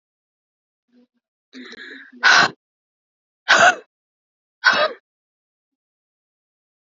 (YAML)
exhalation_length: 6.9 s
exhalation_amplitude: 32767
exhalation_signal_mean_std_ratio: 0.27
survey_phase: beta (2021-08-13 to 2022-03-07)
age: 18-44
gender: Female
wearing_mask: 'No'
symptom_fatigue: true
symptom_headache: true
symptom_onset: 4 days
smoker_status: Current smoker (1 to 10 cigarettes per day)
respiratory_condition_asthma: false
respiratory_condition_other: false
recruitment_source: REACT
submission_delay: 0 days
covid_test_result: Negative
covid_test_method: RT-qPCR
influenza_a_test_result: Negative
influenza_b_test_result: Negative